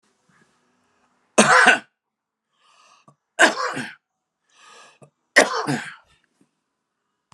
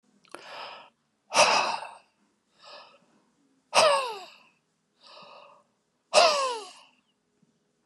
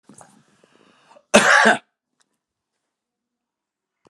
{"three_cough_length": "7.3 s", "three_cough_amplitude": 32756, "three_cough_signal_mean_std_ratio": 0.28, "exhalation_length": "7.9 s", "exhalation_amplitude": 18288, "exhalation_signal_mean_std_ratio": 0.34, "cough_length": "4.1 s", "cough_amplitude": 32767, "cough_signal_mean_std_ratio": 0.26, "survey_phase": "alpha (2021-03-01 to 2021-08-12)", "age": "65+", "gender": "Male", "wearing_mask": "No", "symptom_none": true, "smoker_status": "Ex-smoker", "respiratory_condition_asthma": false, "respiratory_condition_other": false, "recruitment_source": "REACT", "submission_delay": "2 days", "covid_test_result": "Negative", "covid_test_method": "RT-qPCR"}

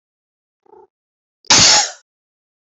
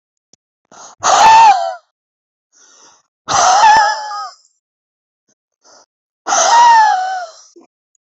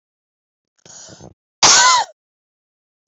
{"cough_length": "2.6 s", "cough_amplitude": 32767, "cough_signal_mean_std_ratio": 0.31, "exhalation_length": "8.0 s", "exhalation_amplitude": 31212, "exhalation_signal_mean_std_ratio": 0.49, "three_cough_length": "3.1 s", "three_cough_amplitude": 32767, "three_cough_signal_mean_std_ratio": 0.32, "survey_phase": "beta (2021-08-13 to 2022-03-07)", "age": "45-64", "gender": "Female", "wearing_mask": "No", "symptom_none": true, "smoker_status": "Ex-smoker", "respiratory_condition_asthma": true, "respiratory_condition_other": false, "recruitment_source": "REACT", "submission_delay": "3 days", "covid_test_result": "Negative", "covid_test_method": "RT-qPCR", "influenza_a_test_result": "Negative", "influenza_b_test_result": "Negative"}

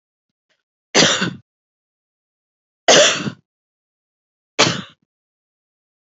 {"three_cough_length": "6.1 s", "three_cough_amplitude": 32446, "three_cough_signal_mean_std_ratio": 0.29, "survey_phase": "alpha (2021-03-01 to 2021-08-12)", "age": "45-64", "gender": "Female", "wearing_mask": "No", "symptom_cough_any": true, "symptom_shortness_of_breath": true, "symptom_abdominal_pain": true, "symptom_fatigue": true, "symptom_fever_high_temperature": true, "symptom_headache": true, "smoker_status": "Never smoked", "respiratory_condition_asthma": false, "respiratory_condition_other": false, "recruitment_source": "Test and Trace", "submission_delay": "1 day", "covid_test_result": "Positive", "covid_test_method": "RT-qPCR", "covid_ct_value": 24.1, "covid_ct_gene": "ORF1ab gene", "covid_ct_mean": 25.8, "covid_viral_load": "3600 copies/ml", "covid_viral_load_category": "Minimal viral load (< 10K copies/ml)"}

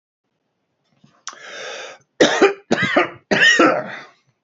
{"three_cough_length": "4.4 s", "three_cough_amplitude": 28603, "three_cough_signal_mean_std_ratio": 0.45, "survey_phase": "beta (2021-08-13 to 2022-03-07)", "age": "65+", "gender": "Male", "wearing_mask": "No", "symptom_none": true, "smoker_status": "Ex-smoker", "respiratory_condition_asthma": false, "respiratory_condition_other": false, "recruitment_source": "REACT", "submission_delay": "2 days", "covid_test_result": "Negative", "covid_test_method": "RT-qPCR", "influenza_a_test_result": "Negative", "influenza_b_test_result": "Negative"}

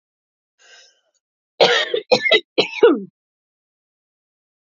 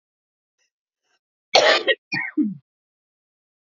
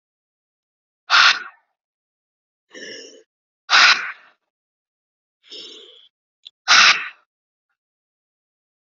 {"three_cough_length": "4.6 s", "three_cough_amplitude": 30846, "three_cough_signal_mean_std_ratio": 0.33, "cough_length": "3.7 s", "cough_amplitude": 32767, "cough_signal_mean_std_ratio": 0.32, "exhalation_length": "8.9 s", "exhalation_amplitude": 32767, "exhalation_signal_mean_std_ratio": 0.27, "survey_phase": "beta (2021-08-13 to 2022-03-07)", "age": "45-64", "gender": "Female", "wearing_mask": "No", "symptom_runny_or_blocked_nose": true, "symptom_fatigue": true, "smoker_status": "Never smoked", "respiratory_condition_asthma": true, "respiratory_condition_other": false, "recruitment_source": "REACT", "submission_delay": "2 days", "covid_test_result": "Negative", "covid_test_method": "RT-qPCR", "influenza_a_test_result": "Negative", "influenza_b_test_result": "Negative"}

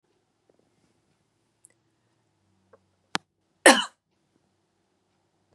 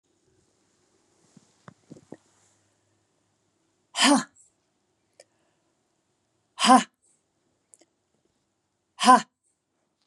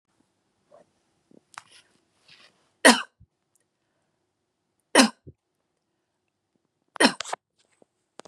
{"cough_length": "5.5 s", "cough_amplitude": 29338, "cough_signal_mean_std_ratio": 0.13, "exhalation_length": "10.1 s", "exhalation_amplitude": 27099, "exhalation_signal_mean_std_ratio": 0.19, "three_cough_length": "8.3 s", "three_cough_amplitude": 30010, "three_cough_signal_mean_std_ratio": 0.17, "survey_phase": "beta (2021-08-13 to 2022-03-07)", "age": "45-64", "gender": "Female", "wearing_mask": "No", "symptom_none": true, "smoker_status": "Never smoked", "respiratory_condition_asthma": false, "respiratory_condition_other": false, "recruitment_source": "REACT", "submission_delay": "7 days", "covid_test_result": "Negative", "covid_test_method": "RT-qPCR", "influenza_a_test_result": "Negative", "influenza_b_test_result": "Negative"}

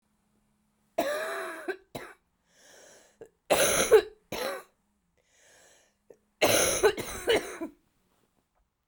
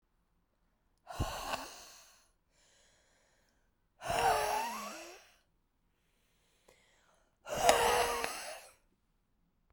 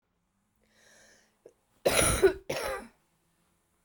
{"three_cough_length": "8.9 s", "three_cough_amplitude": 13782, "three_cough_signal_mean_std_ratio": 0.38, "exhalation_length": "9.7 s", "exhalation_amplitude": 16484, "exhalation_signal_mean_std_ratio": 0.38, "cough_length": "3.8 s", "cough_amplitude": 10707, "cough_signal_mean_std_ratio": 0.33, "survey_phase": "beta (2021-08-13 to 2022-03-07)", "age": "18-44", "gender": "Female", "wearing_mask": "No", "symptom_cough_any": true, "symptom_runny_or_blocked_nose": true, "symptom_sore_throat": true, "symptom_fever_high_temperature": true, "symptom_onset": "5 days", "smoker_status": "Ex-smoker", "respiratory_condition_asthma": false, "respiratory_condition_other": false, "recruitment_source": "Test and Trace", "submission_delay": "2 days", "covid_test_result": "Positive", "covid_test_method": "RT-qPCR", "covid_ct_value": 18.6, "covid_ct_gene": "ORF1ab gene"}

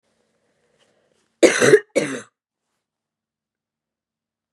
{"cough_length": "4.5 s", "cough_amplitude": 32491, "cough_signal_mean_std_ratio": 0.24, "survey_phase": "beta (2021-08-13 to 2022-03-07)", "age": "18-44", "gender": "Female", "wearing_mask": "Yes", "symptom_cough_any": true, "symptom_runny_or_blocked_nose": true, "symptom_sore_throat": true, "symptom_onset": "7 days", "smoker_status": "Never smoked", "respiratory_condition_asthma": false, "respiratory_condition_other": false, "recruitment_source": "Test and Trace", "submission_delay": "2 days", "covid_test_result": "Positive", "covid_test_method": "RT-qPCR", "covid_ct_value": 25.3, "covid_ct_gene": "ORF1ab gene"}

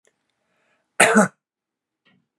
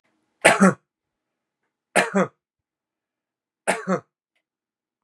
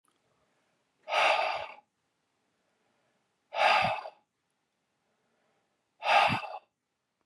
{"cough_length": "2.4 s", "cough_amplitude": 32285, "cough_signal_mean_std_ratio": 0.26, "three_cough_length": "5.0 s", "three_cough_amplitude": 32511, "three_cough_signal_mean_std_ratio": 0.27, "exhalation_length": "7.3 s", "exhalation_amplitude": 9168, "exhalation_signal_mean_std_ratio": 0.35, "survey_phase": "beta (2021-08-13 to 2022-03-07)", "age": "45-64", "gender": "Male", "wearing_mask": "No", "symptom_none": true, "smoker_status": "Never smoked", "respiratory_condition_asthma": true, "respiratory_condition_other": false, "recruitment_source": "REACT", "submission_delay": "1 day", "covid_test_result": "Negative", "covid_test_method": "RT-qPCR", "influenza_a_test_result": "Negative", "influenza_b_test_result": "Negative"}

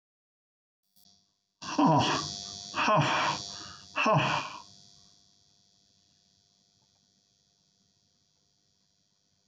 {"exhalation_length": "9.5 s", "exhalation_amplitude": 7315, "exhalation_signal_mean_std_ratio": 0.37, "survey_phase": "beta (2021-08-13 to 2022-03-07)", "age": "65+", "gender": "Male", "wearing_mask": "No", "symptom_fatigue": true, "smoker_status": "Never smoked", "respiratory_condition_asthma": false, "respiratory_condition_other": false, "recruitment_source": "REACT", "submission_delay": "2 days", "covid_test_result": "Negative", "covid_test_method": "RT-qPCR"}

